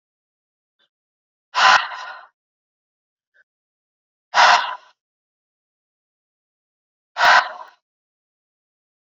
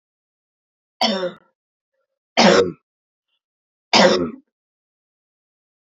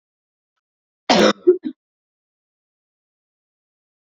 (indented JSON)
{
  "exhalation_length": "9.0 s",
  "exhalation_amplitude": 28871,
  "exhalation_signal_mean_std_ratio": 0.26,
  "three_cough_length": "5.9 s",
  "three_cough_amplitude": 31945,
  "three_cough_signal_mean_std_ratio": 0.3,
  "cough_length": "4.0 s",
  "cough_amplitude": 28314,
  "cough_signal_mean_std_ratio": 0.23,
  "survey_phase": "beta (2021-08-13 to 2022-03-07)",
  "age": "18-44",
  "gender": "Female",
  "wearing_mask": "No",
  "symptom_cough_any": true,
  "symptom_runny_or_blocked_nose": true,
  "symptom_onset": "3 days",
  "smoker_status": "Never smoked",
  "respiratory_condition_asthma": false,
  "respiratory_condition_other": false,
  "recruitment_source": "Test and Trace",
  "submission_delay": "1 day",
  "covid_test_result": "Positive",
  "covid_test_method": "RT-qPCR",
  "covid_ct_value": 20.6,
  "covid_ct_gene": "ORF1ab gene",
  "covid_ct_mean": 21.1,
  "covid_viral_load": "120000 copies/ml",
  "covid_viral_load_category": "Low viral load (10K-1M copies/ml)"
}